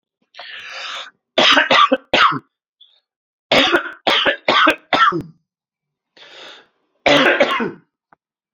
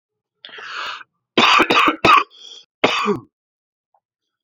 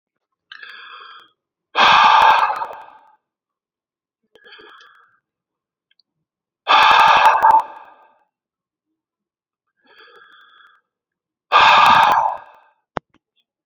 {"three_cough_length": "8.5 s", "three_cough_amplitude": 32529, "three_cough_signal_mean_std_ratio": 0.47, "cough_length": "4.4 s", "cough_amplitude": 31784, "cough_signal_mean_std_ratio": 0.42, "exhalation_length": "13.7 s", "exhalation_amplitude": 32768, "exhalation_signal_mean_std_ratio": 0.37, "survey_phase": "alpha (2021-03-01 to 2021-08-12)", "age": "18-44", "gender": "Male", "wearing_mask": "No", "symptom_cough_any": true, "symptom_shortness_of_breath": true, "symptom_fatigue": true, "symptom_headache": true, "symptom_onset": "3 days", "smoker_status": "Current smoker (11 or more cigarettes per day)", "respiratory_condition_asthma": false, "respiratory_condition_other": false, "recruitment_source": "Test and Trace", "submission_delay": "2 days", "covid_test_result": "Positive", "covid_test_method": "RT-qPCR", "covid_ct_value": 24.4, "covid_ct_gene": "ORF1ab gene", "covid_ct_mean": 24.5, "covid_viral_load": "9500 copies/ml", "covid_viral_load_category": "Minimal viral load (< 10K copies/ml)"}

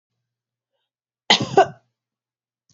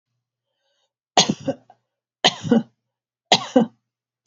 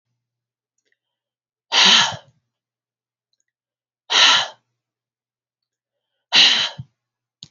{"cough_length": "2.7 s", "cough_amplitude": 29068, "cough_signal_mean_std_ratio": 0.22, "three_cough_length": "4.3 s", "three_cough_amplitude": 31335, "three_cough_signal_mean_std_ratio": 0.28, "exhalation_length": "7.5 s", "exhalation_amplitude": 31188, "exhalation_signal_mean_std_ratio": 0.3, "survey_phase": "alpha (2021-03-01 to 2021-08-12)", "age": "65+", "gender": "Female", "wearing_mask": "No", "symptom_none": true, "smoker_status": "Never smoked", "respiratory_condition_asthma": false, "respiratory_condition_other": false, "recruitment_source": "REACT", "submission_delay": "3 days", "covid_test_result": "Negative", "covid_test_method": "RT-qPCR"}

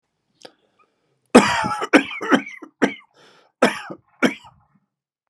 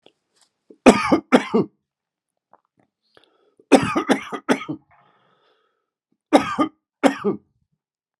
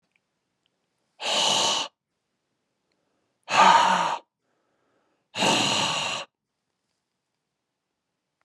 {"cough_length": "5.3 s", "cough_amplitude": 32768, "cough_signal_mean_std_ratio": 0.32, "three_cough_length": "8.2 s", "three_cough_amplitude": 32768, "three_cough_signal_mean_std_ratio": 0.3, "exhalation_length": "8.4 s", "exhalation_amplitude": 20726, "exhalation_signal_mean_std_ratio": 0.38, "survey_phase": "beta (2021-08-13 to 2022-03-07)", "age": "45-64", "gender": "Male", "wearing_mask": "No", "symptom_runny_or_blocked_nose": true, "symptom_sore_throat": true, "symptom_fatigue": true, "symptom_headache": true, "symptom_change_to_sense_of_smell_or_taste": true, "symptom_loss_of_taste": true, "symptom_onset": "5 days", "smoker_status": "Current smoker (11 or more cigarettes per day)", "respiratory_condition_asthma": false, "respiratory_condition_other": false, "recruitment_source": "Test and Trace", "submission_delay": "3 days", "covid_test_result": "Positive", "covid_test_method": "RT-qPCR", "covid_ct_value": 16.5, "covid_ct_gene": "ORF1ab gene", "covid_ct_mean": 16.9, "covid_viral_load": "2900000 copies/ml", "covid_viral_load_category": "High viral load (>1M copies/ml)"}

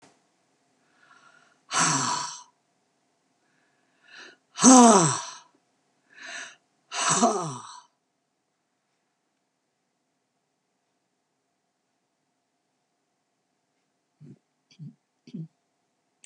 {"exhalation_length": "16.3 s", "exhalation_amplitude": 28859, "exhalation_signal_mean_std_ratio": 0.23, "survey_phase": "beta (2021-08-13 to 2022-03-07)", "age": "65+", "gender": "Female", "wearing_mask": "No", "symptom_cough_any": true, "smoker_status": "Never smoked", "respiratory_condition_asthma": false, "respiratory_condition_other": false, "recruitment_source": "REACT", "submission_delay": "2 days", "covid_test_result": "Negative", "covid_test_method": "RT-qPCR", "influenza_a_test_result": "Negative", "influenza_b_test_result": "Negative"}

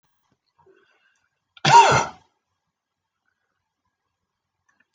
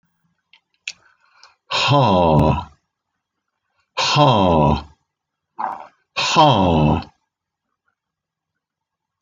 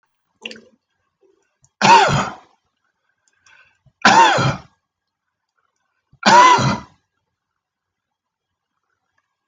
{"cough_length": "4.9 s", "cough_amplitude": 24727, "cough_signal_mean_std_ratio": 0.22, "exhalation_length": "9.2 s", "exhalation_amplitude": 25999, "exhalation_signal_mean_std_ratio": 0.45, "three_cough_length": "9.5 s", "three_cough_amplitude": 30181, "three_cough_signal_mean_std_ratio": 0.32, "survey_phase": "beta (2021-08-13 to 2022-03-07)", "age": "65+", "gender": "Male", "wearing_mask": "No", "symptom_none": true, "symptom_onset": "4 days", "smoker_status": "Never smoked", "respiratory_condition_asthma": false, "respiratory_condition_other": false, "recruitment_source": "REACT", "submission_delay": "1 day", "covid_test_result": "Negative", "covid_test_method": "RT-qPCR"}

